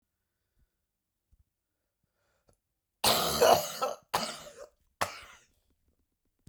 {"cough_length": "6.5 s", "cough_amplitude": 15307, "cough_signal_mean_std_ratio": 0.3, "survey_phase": "beta (2021-08-13 to 2022-03-07)", "age": "65+", "gender": "Male", "wearing_mask": "No", "symptom_cough_any": true, "symptom_new_continuous_cough": true, "symptom_diarrhoea": true, "symptom_fatigue": true, "symptom_onset": "3 days", "smoker_status": "Ex-smoker", "respiratory_condition_asthma": false, "respiratory_condition_other": false, "recruitment_source": "Test and Trace", "submission_delay": "1 day", "covid_test_result": "Positive", "covid_test_method": "RT-qPCR", "covid_ct_value": 20.8, "covid_ct_gene": "N gene"}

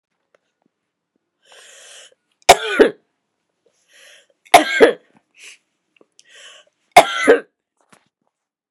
{"three_cough_length": "8.7 s", "three_cough_amplitude": 32768, "three_cough_signal_mean_std_ratio": 0.24, "survey_phase": "beta (2021-08-13 to 2022-03-07)", "age": "45-64", "gender": "Female", "wearing_mask": "No", "symptom_cough_any": true, "symptom_runny_or_blocked_nose": true, "symptom_sore_throat": true, "symptom_onset": "3 days", "smoker_status": "Never smoked", "respiratory_condition_asthma": true, "respiratory_condition_other": false, "recruitment_source": "Test and Trace", "submission_delay": "1 day", "covid_test_result": "Positive", "covid_test_method": "RT-qPCR", "covid_ct_value": 17.9, "covid_ct_gene": "ORF1ab gene", "covid_ct_mean": 18.0, "covid_viral_load": "1300000 copies/ml", "covid_viral_load_category": "High viral load (>1M copies/ml)"}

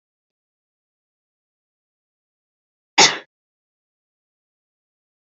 {"cough_length": "5.4 s", "cough_amplitude": 32768, "cough_signal_mean_std_ratio": 0.13, "survey_phase": "beta (2021-08-13 to 2022-03-07)", "age": "18-44", "gender": "Female", "wearing_mask": "No", "symptom_none": true, "smoker_status": "Never smoked", "respiratory_condition_asthma": false, "respiratory_condition_other": false, "recruitment_source": "REACT", "submission_delay": "0 days", "covid_test_result": "Negative", "covid_test_method": "RT-qPCR", "influenza_a_test_result": "Negative", "influenza_b_test_result": "Negative"}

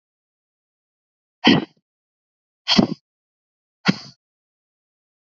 {"exhalation_length": "5.2 s", "exhalation_amplitude": 29281, "exhalation_signal_mean_std_ratio": 0.22, "survey_phase": "alpha (2021-03-01 to 2021-08-12)", "age": "18-44", "gender": "Female", "wearing_mask": "No", "symptom_cough_any": true, "symptom_fatigue": true, "symptom_fever_high_temperature": true, "smoker_status": "Never smoked", "respiratory_condition_asthma": false, "respiratory_condition_other": false, "recruitment_source": "Test and Trace", "submission_delay": "2 days", "covid_test_result": "Positive", "covid_test_method": "RT-qPCR"}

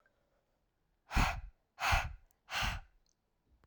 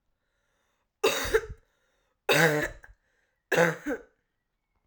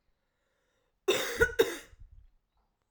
{"exhalation_length": "3.7 s", "exhalation_amplitude": 4459, "exhalation_signal_mean_std_ratio": 0.38, "three_cough_length": "4.9 s", "three_cough_amplitude": 15317, "three_cough_signal_mean_std_ratio": 0.37, "cough_length": "2.9 s", "cough_amplitude": 10298, "cough_signal_mean_std_ratio": 0.32, "survey_phase": "alpha (2021-03-01 to 2021-08-12)", "age": "18-44", "gender": "Female", "wearing_mask": "No", "symptom_cough_any": true, "symptom_fatigue": true, "symptom_headache": true, "symptom_onset": "4 days", "smoker_status": "Never smoked", "respiratory_condition_asthma": false, "respiratory_condition_other": false, "recruitment_source": "Test and Trace", "submission_delay": "2 days", "covid_test_result": "Positive", "covid_test_method": "RT-qPCR"}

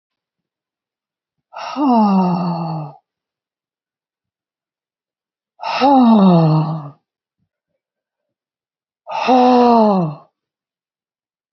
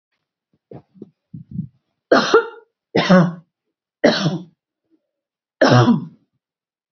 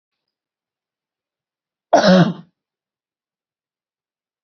{"exhalation_length": "11.5 s", "exhalation_amplitude": 29324, "exhalation_signal_mean_std_ratio": 0.44, "three_cough_length": "6.9 s", "three_cough_amplitude": 30404, "three_cough_signal_mean_std_ratio": 0.37, "cough_length": "4.4 s", "cough_amplitude": 28335, "cough_signal_mean_std_ratio": 0.23, "survey_phase": "beta (2021-08-13 to 2022-03-07)", "age": "45-64", "gender": "Female", "wearing_mask": "No", "symptom_none": true, "smoker_status": "Never smoked", "respiratory_condition_asthma": true, "respiratory_condition_other": false, "recruitment_source": "Test and Trace", "submission_delay": "1 day", "covid_test_result": "Negative", "covid_test_method": "LFT"}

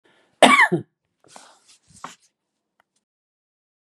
{"cough_length": "3.9 s", "cough_amplitude": 32767, "cough_signal_mean_std_ratio": 0.22, "survey_phase": "beta (2021-08-13 to 2022-03-07)", "age": "65+", "gender": "Female", "wearing_mask": "No", "symptom_none": true, "symptom_onset": "12 days", "smoker_status": "Ex-smoker", "respiratory_condition_asthma": true, "respiratory_condition_other": true, "recruitment_source": "REACT", "submission_delay": "1 day", "covid_test_result": "Negative", "covid_test_method": "RT-qPCR", "influenza_a_test_result": "Unknown/Void", "influenza_b_test_result": "Unknown/Void"}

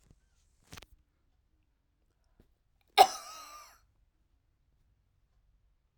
{"cough_length": "6.0 s", "cough_amplitude": 14738, "cough_signal_mean_std_ratio": 0.13, "survey_phase": "alpha (2021-03-01 to 2021-08-12)", "age": "65+", "gender": "Female", "wearing_mask": "No", "symptom_none": true, "smoker_status": "Never smoked", "respiratory_condition_asthma": false, "respiratory_condition_other": false, "recruitment_source": "REACT", "submission_delay": "3 days", "covid_test_result": "Negative", "covid_test_method": "RT-qPCR"}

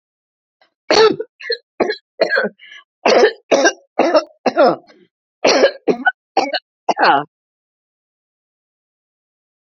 {"cough_length": "9.7 s", "cough_amplitude": 30207, "cough_signal_mean_std_ratio": 0.42, "survey_phase": "beta (2021-08-13 to 2022-03-07)", "age": "65+", "gender": "Female", "wearing_mask": "No", "symptom_shortness_of_breath": true, "smoker_status": "Never smoked", "respiratory_condition_asthma": false, "respiratory_condition_other": false, "recruitment_source": "REACT", "submission_delay": "2 days", "covid_test_result": "Negative", "covid_test_method": "RT-qPCR", "influenza_a_test_result": "Negative", "influenza_b_test_result": "Negative"}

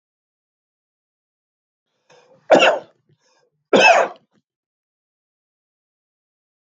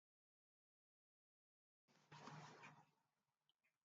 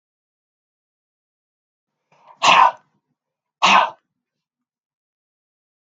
{"three_cough_length": "6.7 s", "three_cough_amplitude": 32767, "three_cough_signal_mean_std_ratio": 0.24, "cough_length": "3.8 s", "cough_amplitude": 186, "cough_signal_mean_std_ratio": 0.37, "exhalation_length": "5.8 s", "exhalation_amplitude": 32766, "exhalation_signal_mean_std_ratio": 0.24, "survey_phase": "beta (2021-08-13 to 2022-03-07)", "age": "65+", "gender": "Male", "wearing_mask": "No", "symptom_none": true, "symptom_onset": "12 days", "smoker_status": "Ex-smoker", "respiratory_condition_asthma": false, "respiratory_condition_other": false, "recruitment_source": "REACT", "submission_delay": "1 day", "covid_test_result": "Negative", "covid_test_method": "RT-qPCR", "influenza_a_test_result": "Negative", "influenza_b_test_result": "Negative"}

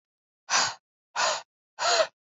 {"exhalation_length": "2.3 s", "exhalation_amplitude": 11012, "exhalation_signal_mean_std_ratio": 0.46, "survey_phase": "alpha (2021-03-01 to 2021-08-12)", "age": "18-44", "gender": "Female", "wearing_mask": "No", "symptom_cough_any": true, "symptom_new_continuous_cough": true, "symptom_diarrhoea": true, "symptom_headache": true, "symptom_change_to_sense_of_smell_or_taste": true, "symptom_onset": "4 days", "smoker_status": "Never smoked", "respiratory_condition_asthma": false, "respiratory_condition_other": false, "recruitment_source": "Test and Trace", "submission_delay": "1 day", "covid_test_result": "Positive", "covid_test_method": "RT-qPCR", "covid_ct_value": 16.8, "covid_ct_gene": "ORF1ab gene", "covid_ct_mean": 17.3, "covid_viral_load": "2200000 copies/ml", "covid_viral_load_category": "High viral load (>1M copies/ml)"}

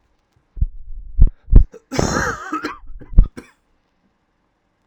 {"cough_length": "4.9 s", "cough_amplitude": 32768, "cough_signal_mean_std_ratio": 0.32, "survey_phase": "alpha (2021-03-01 to 2021-08-12)", "age": "18-44", "gender": "Male", "wearing_mask": "No", "symptom_cough_any": true, "symptom_new_continuous_cough": true, "symptom_fatigue": true, "symptom_fever_high_temperature": true, "symptom_change_to_sense_of_smell_or_taste": true, "symptom_loss_of_taste": true, "symptom_onset": "5 days", "smoker_status": "Never smoked", "respiratory_condition_asthma": true, "respiratory_condition_other": false, "recruitment_source": "Test and Trace", "submission_delay": "1 day", "covid_test_result": "Positive", "covid_test_method": "RT-qPCR"}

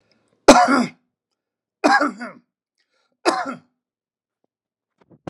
{"three_cough_length": "5.3 s", "three_cough_amplitude": 32768, "three_cough_signal_mean_std_ratio": 0.29, "survey_phase": "beta (2021-08-13 to 2022-03-07)", "age": "65+", "gender": "Male", "wearing_mask": "No", "symptom_none": true, "smoker_status": "Never smoked", "respiratory_condition_asthma": false, "respiratory_condition_other": false, "recruitment_source": "REACT", "submission_delay": "1 day", "covid_test_result": "Negative", "covid_test_method": "RT-qPCR"}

